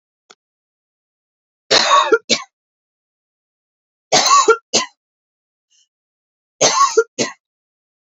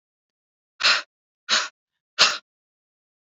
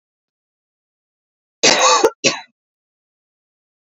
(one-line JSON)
{"three_cough_length": "8.0 s", "three_cough_amplitude": 31264, "three_cough_signal_mean_std_ratio": 0.34, "exhalation_length": "3.2 s", "exhalation_amplitude": 25368, "exhalation_signal_mean_std_ratio": 0.3, "cough_length": "3.8 s", "cough_amplitude": 31637, "cough_signal_mean_std_ratio": 0.3, "survey_phase": "alpha (2021-03-01 to 2021-08-12)", "age": "18-44", "gender": "Female", "wearing_mask": "No", "symptom_cough_any": true, "symptom_fatigue": true, "symptom_change_to_sense_of_smell_or_taste": true, "smoker_status": "Prefer not to say", "respiratory_condition_asthma": false, "respiratory_condition_other": false, "recruitment_source": "Test and Trace", "submission_delay": "2 days", "covid_test_result": "Positive", "covid_test_method": "RT-qPCR", "covid_ct_value": 15.1, "covid_ct_gene": "N gene", "covid_ct_mean": 15.3, "covid_viral_load": "9300000 copies/ml", "covid_viral_load_category": "High viral load (>1M copies/ml)"}